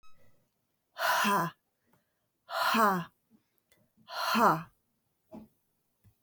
{
  "exhalation_length": "6.2 s",
  "exhalation_amplitude": 6900,
  "exhalation_signal_mean_std_ratio": 0.41,
  "survey_phase": "beta (2021-08-13 to 2022-03-07)",
  "age": "45-64",
  "gender": "Female",
  "wearing_mask": "No",
  "symptom_cough_any": true,
  "symptom_runny_or_blocked_nose": true,
  "symptom_sore_throat": true,
  "symptom_fatigue": true,
  "symptom_other": true,
  "symptom_onset": "4 days",
  "smoker_status": "Never smoked",
  "respiratory_condition_asthma": false,
  "respiratory_condition_other": false,
  "recruitment_source": "Test and Trace",
  "submission_delay": "1 day",
  "covid_test_result": "Positive",
  "covid_test_method": "RT-qPCR",
  "covid_ct_value": 21.9,
  "covid_ct_gene": "ORF1ab gene"
}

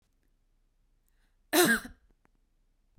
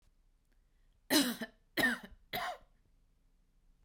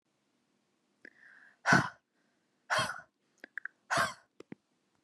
{
  "cough_length": "3.0 s",
  "cough_amplitude": 9339,
  "cough_signal_mean_std_ratio": 0.26,
  "three_cough_length": "3.8 s",
  "three_cough_amplitude": 6220,
  "three_cough_signal_mean_std_ratio": 0.35,
  "exhalation_length": "5.0 s",
  "exhalation_amplitude": 9735,
  "exhalation_signal_mean_std_ratio": 0.28,
  "survey_phase": "beta (2021-08-13 to 2022-03-07)",
  "age": "18-44",
  "gender": "Female",
  "wearing_mask": "No",
  "symptom_cough_any": true,
  "symptom_runny_or_blocked_nose": true,
  "symptom_sore_throat": true,
  "symptom_fatigue": true,
  "symptom_onset": "2 days",
  "smoker_status": "Never smoked",
  "respiratory_condition_asthma": false,
  "respiratory_condition_other": false,
  "recruitment_source": "Test and Trace",
  "submission_delay": "1 day",
  "covid_test_result": "Negative",
  "covid_test_method": "RT-qPCR"
}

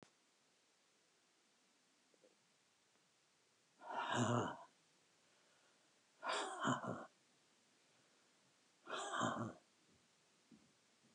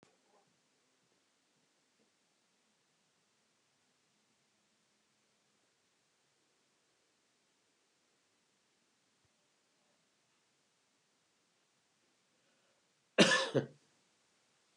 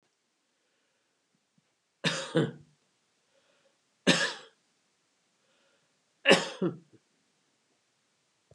{
  "exhalation_length": "11.1 s",
  "exhalation_amplitude": 1660,
  "exhalation_signal_mean_std_ratio": 0.37,
  "cough_length": "14.8 s",
  "cough_amplitude": 9365,
  "cough_signal_mean_std_ratio": 0.13,
  "three_cough_length": "8.5 s",
  "three_cough_amplitude": 17926,
  "three_cough_signal_mean_std_ratio": 0.24,
  "survey_phase": "beta (2021-08-13 to 2022-03-07)",
  "age": "65+",
  "gender": "Male",
  "wearing_mask": "No",
  "symptom_none": true,
  "smoker_status": "Never smoked",
  "respiratory_condition_asthma": false,
  "respiratory_condition_other": false,
  "recruitment_source": "REACT",
  "submission_delay": "5 days",
  "covid_test_result": "Negative",
  "covid_test_method": "RT-qPCR",
  "influenza_a_test_result": "Negative",
  "influenza_b_test_result": "Negative"
}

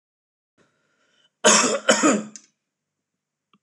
{
  "cough_length": "3.6 s",
  "cough_amplitude": 25679,
  "cough_signal_mean_std_ratio": 0.34,
  "survey_phase": "alpha (2021-03-01 to 2021-08-12)",
  "age": "18-44",
  "gender": "Male",
  "wearing_mask": "No",
  "symptom_none": true,
  "smoker_status": "Never smoked",
  "respiratory_condition_asthma": false,
  "respiratory_condition_other": false,
  "recruitment_source": "REACT",
  "submission_delay": "3 days",
  "covid_test_result": "Negative",
  "covid_test_method": "RT-qPCR"
}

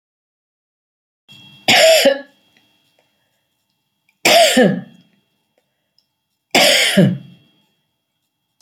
{
  "three_cough_length": "8.6 s",
  "three_cough_amplitude": 32767,
  "three_cough_signal_mean_std_ratio": 0.37,
  "survey_phase": "alpha (2021-03-01 to 2021-08-12)",
  "age": "65+",
  "gender": "Female",
  "wearing_mask": "No",
  "symptom_none": true,
  "smoker_status": "Never smoked",
  "respiratory_condition_asthma": false,
  "respiratory_condition_other": false,
  "recruitment_source": "REACT",
  "submission_delay": "2 days",
  "covid_test_result": "Negative",
  "covid_test_method": "RT-qPCR"
}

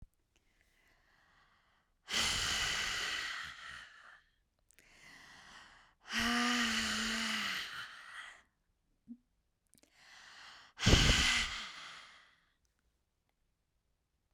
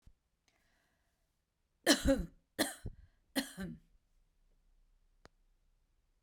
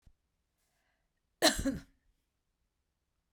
{
  "exhalation_length": "14.3 s",
  "exhalation_amplitude": 9697,
  "exhalation_signal_mean_std_ratio": 0.43,
  "three_cough_length": "6.2 s",
  "three_cough_amplitude": 7544,
  "three_cough_signal_mean_std_ratio": 0.25,
  "cough_length": "3.3 s",
  "cough_amplitude": 10305,
  "cough_signal_mean_std_ratio": 0.22,
  "survey_phase": "beta (2021-08-13 to 2022-03-07)",
  "age": "45-64",
  "gender": "Female",
  "wearing_mask": "No",
  "symptom_none": true,
  "smoker_status": "Never smoked",
  "respiratory_condition_asthma": false,
  "respiratory_condition_other": false,
  "recruitment_source": "REACT",
  "submission_delay": "15 days",
  "covid_test_result": "Negative",
  "covid_test_method": "RT-qPCR",
  "influenza_a_test_result": "Unknown/Void",
  "influenza_b_test_result": "Unknown/Void"
}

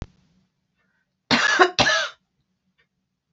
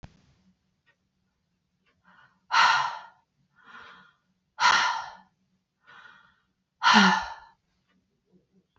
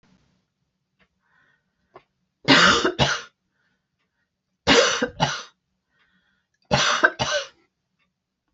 {
  "cough_length": "3.3 s",
  "cough_amplitude": 27259,
  "cough_signal_mean_std_ratio": 0.35,
  "exhalation_length": "8.8 s",
  "exhalation_amplitude": 18162,
  "exhalation_signal_mean_std_ratio": 0.31,
  "three_cough_length": "8.5 s",
  "three_cough_amplitude": 26745,
  "three_cough_signal_mean_std_ratio": 0.35,
  "survey_phase": "beta (2021-08-13 to 2022-03-07)",
  "age": "65+",
  "gender": "Female",
  "wearing_mask": "No",
  "symptom_none": true,
  "smoker_status": "Never smoked",
  "respiratory_condition_asthma": false,
  "respiratory_condition_other": false,
  "recruitment_source": "REACT",
  "submission_delay": "2 days",
  "covid_test_result": "Negative",
  "covid_test_method": "RT-qPCR",
  "influenza_a_test_result": "Negative",
  "influenza_b_test_result": "Negative"
}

